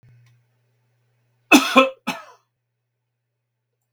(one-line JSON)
{"cough_length": "3.9 s", "cough_amplitude": 32768, "cough_signal_mean_std_ratio": 0.22, "survey_phase": "beta (2021-08-13 to 2022-03-07)", "age": "65+", "gender": "Male", "wearing_mask": "No", "symptom_none": true, "smoker_status": "Never smoked", "respiratory_condition_asthma": false, "respiratory_condition_other": false, "recruitment_source": "REACT", "submission_delay": "1 day", "covid_test_result": "Negative", "covid_test_method": "RT-qPCR", "influenza_a_test_result": "Negative", "influenza_b_test_result": "Negative"}